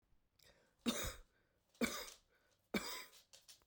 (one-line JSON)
{"three_cough_length": "3.7 s", "three_cough_amplitude": 2042, "three_cough_signal_mean_std_ratio": 0.38, "survey_phase": "beta (2021-08-13 to 2022-03-07)", "age": "45-64", "gender": "Female", "wearing_mask": "No", "symptom_cough_any": true, "symptom_new_continuous_cough": true, "symptom_runny_or_blocked_nose": true, "symptom_sore_throat": true, "symptom_fatigue": true, "symptom_headache": true, "symptom_change_to_sense_of_smell_or_taste": true, "symptom_onset": "4 days", "smoker_status": "Never smoked", "respiratory_condition_asthma": true, "respiratory_condition_other": false, "recruitment_source": "Test and Trace", "submission_delay": "3 days", "covid_test_result": "Positive", "covid_test_method": "RT-qPCR", "covid_ct_value": 18.6, "covid_ct_gene": "ORF1ab gene", "covid_ct_mean": 19.1, "covid_viral_load": "560000 copies/ml", "covid_viral_load_category": "Low viral load (10K-1M copies/ml)"}